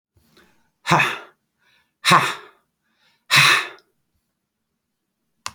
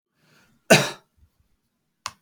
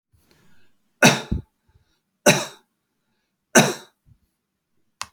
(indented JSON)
{
  "exhalation_length": "5.5 s",
  "exhalation_amplitude": 32767,
  "exhalation_signal_mean_std_ratio": 0.31,
  "cough_length": "2.2 s",
  "cough_amplitude": 29588,
  "cough_signal_mean_std_ratio": 0.21,
  "three_cough_length": "5.1 s",
  "three_cough_amplitude": 32767,
  "three_cough_signal_mean_std_ratio": 0.25,
  "survey_phase": "alpha (2021-03-01 to 2021-08-12)",
  "age": "65+",
  "gender": "Male",
  "wearing_mask": "No",
  "symptom_none": true,
  "smoker_status": "Never smoked",
  "respiratory_condition_asthma": false,
  "respiratory_condition_other": false,
  "recruitment_source": "REACT",
  "submission_delay": "1 day",
  "covid_test_result": "Negative",
  "covid_test_method": "RT-qPCR"
}